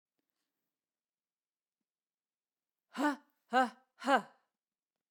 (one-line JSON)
{"exhalation_length": "5.1 s", "exhalation_amplitude": 6655, "exhalation_signal_mean_std_ratio": 0.23, "survey_phase": "beta (2021-08-13 to 2022-03-07)", "age": "45-64", "gender": "Female", "wearing_mask": "No", "symptom_none": true, "smoker_status": "Never smoked", "respiratory_condition_asthma": false, "respiratory_condition_other": false, "recruitment_source": "REACT", "submission_delay": "2 days", "covid_test_result": "Negative", "covid_test_method": "RT-qPCR"}